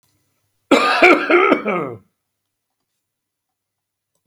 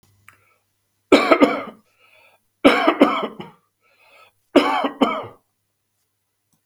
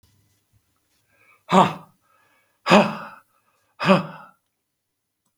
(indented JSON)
{
  "cough_length": "4.3 s",
  "cough_amplitude": 32768,
  "cough_signal_mean_std_ratio": 0.38,
  "three_cough_length": "6.7 s",
  "three_cough_amplitude": 32768,
  "three_cough_signal_mean_std_ratio": 0.35,
  "exhalation_length": "5.4 s",
  "exhalation_amplitude": 32768,
  "exhalation_signal_mean_std_ratio": 0.26,
  "survey_phase": "beta (2021-08-13 to 2022-03-07)",
  "age": "65+",
  "gender": "Male",
  "wearing_mask": "No",
  "symptom_runny_or_blocked_nose": true,
  "symptom_onset": "12 days",
  "smoker_status": "Ex-smoker",
  "respiratory_condition_asthma": false,
  "respiratory_condition_other": true,
  "recruitment_source": "REACT",
  "submission_delay": "2 days",
  "covid_test_result": "Negative",
  "covid_test_method": "RT-qPCR",
  "influenza_a_test_result": "Negative",
  "influenza_b_test_result": "Negative"
}